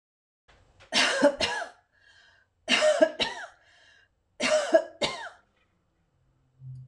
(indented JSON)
{
  "three_cough_length": "6.9 s",
  "three_cough_amplitude": 15254,
  "three_cough_signal_mean_std_ratio": 0.41,
  "survey_phase": "beta (2021-08-13 to 2022-03-07)",
  "age": "45-64",
  "gender": "Female",
  "wearing_mask": "No",
  "symptom_none": true,
  "smoker_status": "Never smoked",
  "respiratory_condition_asthma": false,
  "respiratory_condition_other": false,
  "recruitment_source": "REACT",
  "submission_delay": "1 day",
  "covid_test_result": "Negative",
  "covid_test_method": "RT-qPCR",
  "influenza_a_test_result": "Negative",
  "influenza_b_test_result": "Negative"
}